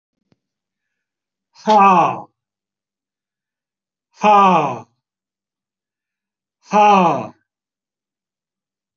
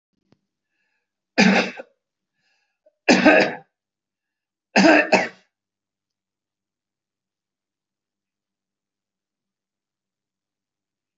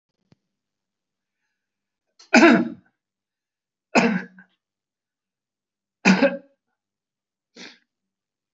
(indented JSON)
{
  "exhalation_length": "9.0 s",
  "exhalation_amplitude": 26243,
  "exhalation_signal_mean_std_ratio": 0.34,
  "three_cough_length": "11.2 s",
  "three_cough_amplitude": 29546,
  "three_cough_signal_mean_std_ratio": 0.25,
  "cough_length": "8.5 s",
  "cough_amplitude": 28296,
  "cough_signal_mean_std_ratio": 0.24,
  "survey_phase": "alpha (2021-03-01 to 2021-08-12)",
  "age": "65+",
  "gender": "Male",
  "wearing_mask": "No",
  "symptom_none": true,
  "smoker_status": "Ex-smoker",
  "respiratory_condition_asthma": false,
  "respiratory_condition_other": false,
  "recruitment_source": "REACT",
  "submission_delay": "2 days",
  "covid_test_result": "Negative",
  "covid_test_method": "RT-qPCR"
}